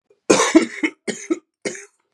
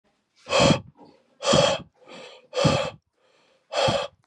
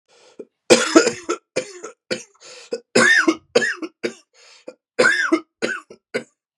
{
  "cough_length": "2.1 s",
  "cough_amplitude": 32767,
  "cough_signal_mean_std_ratio": 0.4,
  "exhalation_length": "4.3 s",
  "exhalation_amplitude": 21661,
  "exhalation_signal_mean_std_ratio": 0.47,
  "three_cough_length": "6.6 s",
  "three_cough_amplitude": 32768,
  "three_cough_signal_mean_std_ratio": 0.41,
  "survey_phase": "beta (2021-08-13 to 2022-03-07)",
  "age": "18-44",
  "gender": "Male",
  "wearing_mask": "No",
  "symptom_cough_any": true,
  "symptom_runny_or_blocked_nose": true,
  "symptom_fatigue": true,
  "symptom_fever_high_temperature": true,
  "symptom_headache": true,
  "symptom_change_to_sense_of_smell_or_taste": true,
  "symptom_onset": "3 days",
  "smoker_status": "Never smoked",
  "respiratory_condition_asthma": false,
  "respiratory_condition_other": false,
  "recruitment_source": "Test and Trace",
  "submission_delay": "2 days",
  "covid_test_result": "Positive",
  "covid_test_method": "RT-qPCR",
  "covid_ct_value": 15.5,
  "covid_ct_gene": "ORF1ab gene",
  "covid_ct_mean": 15.9,
  "covid_viral_load": "6100000 copies/ml",
  "covid_viral_load_category": "High viral load (>1M copies/ml)"
}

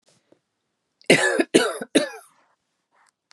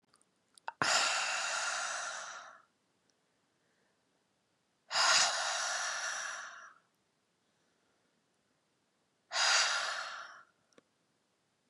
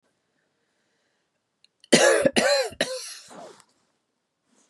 {
  "cough_length": "3.3 s",
  "cough_amplitude": 31353,
  "cough_signal_mean_std_ratio": 0.33,
  "exhalation_length": "11.7 s",
  "exhalation_amplitude": 6771,
  "exhalation_signal_mean_std_ratio": 0.46,
  "three_cough_length": "4.7 s",
  "three_cough_amplitude": 28756,
  "three_cough_signal_mean_std_ratio": 0.34,
  "survey_phase": "beta (2021-08-13 to 2022-03-07)",
  "age": "18-44",
  "gender": "Female",
  "wearing_mask": "No",
  "symptom_sore_throat": true,
  "symptom_other": true,
  "smoker_status": "Never smoked",
  "respiratory_condition_asthma": false,
  "respiratory_condition_other": false,
  "recruitment_source": "Test and Trace",
  "submission_delay": "2 days",
  "covid_test_result": "Positive",
  "covid_test_method": "RT-qPCR",
  "covid_ct_value": 23.5,
  "covid_ct_gene": "ORF1ab gene"
}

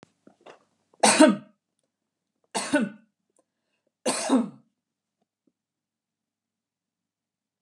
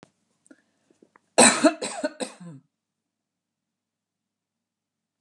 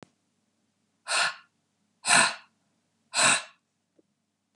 {
  "three_cough_length": "7.6 s",
  "three_cough_amplitude": 18785,
  "three_cough_signal_mean_std_ratio": 0.26,
  "cough_length": "5.2 s",
  "cough_amplitude": 26166,
  "cough_signal_mean_std_ratio": 0.22,
  "exhalation_length": "4.6 s",
  "exhalation_amplitude": 16806,
  "exhalation_signal_mean_std_ratio": 0.32,
  "survey_phase": "beta (2021-08-13 to 2022-03-07)",
  "age": "45-64",
  "gender": "Female",
  "wearing_mask": "No",
  "symptom_none": true,
  "smoker_status": "Never smoked",
  "respiratory_condition_asthma": false,
  "respiratory_condition_other": false,
  "recruitment_source": "REACT",
  "submission_delay": "1 day",
  "covid_test_result": "Negative",
  "covid_test_method": "RT-qPCR"
}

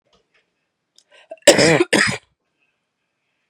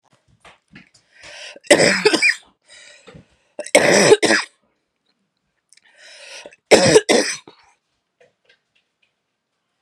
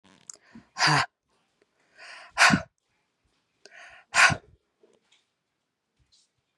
{
  "cough_length": "3.5 s",
  "cough_amplitude": 32768,
  "cough_signal_mean_std_ratio": 0.3,
  "three_cough_length": "9.8 s",
  "three_cough_amplitude": 32768,
  "three_cough_signal_mean_std_ratio": 0.33,
  "exhalation_length": "6.6 s",
  "exhalation_amplitude": 27264,
  "exhalation_signal_mean_std_ratio": 0.26,
  "survey_phase": "beta (2021-08-13 to 2022-03-07)",
  "age": "18-44",
  "gender": "Female",
  "wearing_mask": "No",
  "symptom_cough_any": true,
  "symptom_runny_or_blocked_nose": true,
  "symptom_headache": true,
  "symptom_change_to_sense_of_smell_or_taste": true,
  "smoker_status": "Ex-smoker",
  "respiratory_condition_asthma": false,
  "respiratory_condition_other": false,
  "recruitment_source": "REACT",
  "submission_delay": "8 days",
  "covid_test_result": "Negative",
  "covid_test_method": "RT-qPCR",
  "influenza_a_test_result": "Negative",
  "influenza_b_test_result": "Negative"
}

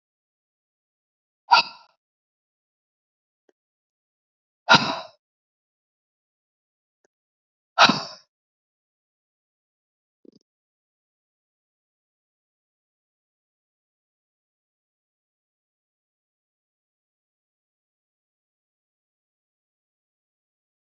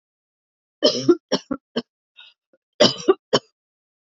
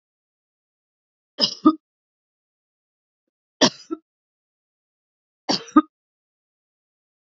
{
  "exhalation_length": "20.8 s",
  "exhalation_amplitude": 29569,
  "exhalation_signal_mean_std_ratio": 0.12,
  "cough_length": "4.1 s",
  "cough_amplitude": 28742,
  "cough_signal_mean_std_ratio": 0.29,
  "three_cough_length": "7.3 s",
  "three_cough_amplitude": 27525,
  "three_cough_signal_mean_std_ratio": 0.17,
  "survey_phase": "alpha (2021-03-01 to 2021-08-12)",
  "age": "45-64",
  "gender": "Female",
  "wearing_mask": "No",
  "symptom_fatigue": true,
  "symptom_onset": "11 days",
  "smoker_status": "Ex-smoker",
  "respiratory_condition_asthma": false,
  "respiratory_condition_other": false,
  "recruitment_source": "REACT",
  "submission_delay": "1 day",
  "covid_test_result": "Negative",
  "covid_test_method": "RT-qPCR"
}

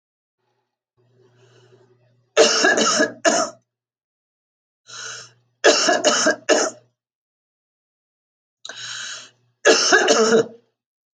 {
  "three_cough_length": "11.2 s",
  "three_cough_amplitude": 29583,
  "three_cough_signal_mean_std_ratio": 0.41,
  "survey_phase": "alpha (2021-03-01 to 2021-08-12)",
  "age": "45-64",
  "gender": "Female",
  "wearing_mask": "No",
  "symptom_none": true,
  "smoker_status": "Ex-smoker",
  "respiratory_condition_asthma": false,
  "respiratory_condition_other": false,
  "recruitment_source": "REACT",
  "submission_delay": "1 day",
  "covid_test_result": "Negative",
  "covid_test_method": "RT-qPCR"
}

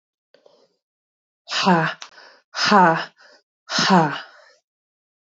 {
  "exhalation_length": "5.3 s",
  "exhalation_amplitude": 32224,
  "exhalation_signal_mean_std_ratio": 0.39,
  "survey_phase": "beta (2021-08-13 to 2022-03-07)",
  "age": "18-44",
  "gender": "Female",
  "wearing_mask": "No",
  "symptom_cough_any": true,
  "symptom_runny_or_blocked_nose": true,
  "symptom_shortness_of_breath": true,
  "symptom_sore_throat": true,
  "symptom_fatigue": true,
  "symptom_fever_high_temperature": true,
  "symptom_headache": true,
  "smoker_status": "Never smoked",
  "respiratory_condition_asthma": false,
  "respiratory_condition_other": false,
  "recruitment_source": "Test and Trace",
  "submission_delay": "2 days",
  "covid_test_result": "Positive",
  "covid_test_method": "LFT"
}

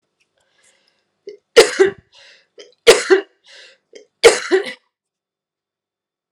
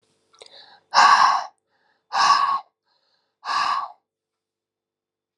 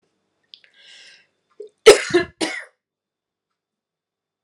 {
  "three_cough_length": "6.3 s",
  "three_cough_amplitude": 32768,
  "three_cough_signal_mean_std_ratio": 0.27,
  "exhalation_length": "5.4 s",
  "exhalation_amplitude": 25679,
  "exhalation_signal_mean_std_ratio": 0.39,
  "cough_length": "4.4 s",
  "cough_amplitude": 32768,
  "cough_signal_mean_std_ratio": 0.2,
  "survey_phase": "alpha (2021-03-01 to 2021-08-12)",
  "age": "18-44",
  "gender": "Female",
  "wearing_mask": "No",
  "symptom_none": true,
  "smoker_status": "Ex-smoker",
  "respiratory_condition_asthma": false,
  "respiratory_condition_other": false,
  "recruitment_source": "Test and Trace",
  "submission_delay": "1 day",
  "covid_test_result": "Positive",
  "covid_test_method": "RT-qPCR",
  "covid_ct_value": 23.0,
  "covid_ct_gene": "N gene",
  "covid_ct_mean": 24.2,
  "covid_viral_load": "11000 copies/ml",
  "covid_viral_load_category": "Low viral load (10K-1M copies/ml)"
}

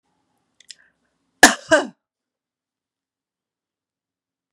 {
  "cough_length": "4.5 s",
  "cough_amplitude": 32768,
  "cough_signal_mean_std_ratio": 0.16,
  "survey_phase": "beta (2021-08-13 to 2022-03-07)",
  "age": "45-64",
  "gender": "Female",
  "wearing_mask": "No",
  "symptom_none": true,
  "smoker_status": "Never smoked",
  "respiratory_condition_asthma": false,
  "respiratory_condition_other": false,
  "recruitment_source": "REACT",
  "submission_delay": "1 day",
  "covid_test_result": "Negative",
  "covid_test_method": "RT-qPCR",
  "influenza_a_test_result": "Negative",
  "influenza_b_test_result": "Negative"
}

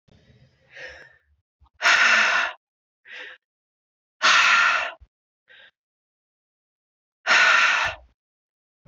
{
  "exhalation_length": "8.9 s",
  "exhalation_amplitude": 18342,
  "exhalation_signal_mean_std_ratio": 0.41,
  "survey_phase": "beta (2021-08-13 to 2022-03-07)",
  "age": "45-64",
  "gender": "Female",
  "wearing_mask": "No",
  "symptom_cough_any": true,
  "symptom_sore_throat": true,
  "symptom_fatigue": true,
  "symptom_headache": true,
  "smoker_status": "Never smoked",
  "respiratory_condition_asthma": false,
  "respiratory_condition_other": false,
  "recruitment_source": "Test and Trace",
  "submission_delay": "10 days",
  "covid_test_result": "Negative",
  "covid_test_method": "RT-qPCR"
}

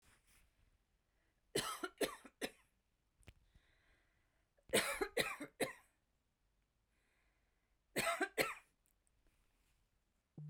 {
  "three_cough_length": "10.5 s",
  "three_cough_amplitude": 3289,
  "three_cough_signal_mean_std_ratio": 0.31,
  "survey_phase": "beta (2021-08-13 to 2022-03-07)",
  "age": "45-64",
  "gender": "Female",
  "wearing_mask": "No",
  "symptom_none": true,
  "smoker_status": "Never smoked",
  "respiratory_condition_asthma": true,
  "respiratory_condition_other": false,
  "recruitment_source": "REACT",
  "submission_delay": "2 days",
  "covid_test_result": "Negative",
  "covid_test_method": "RT-qPCR"
}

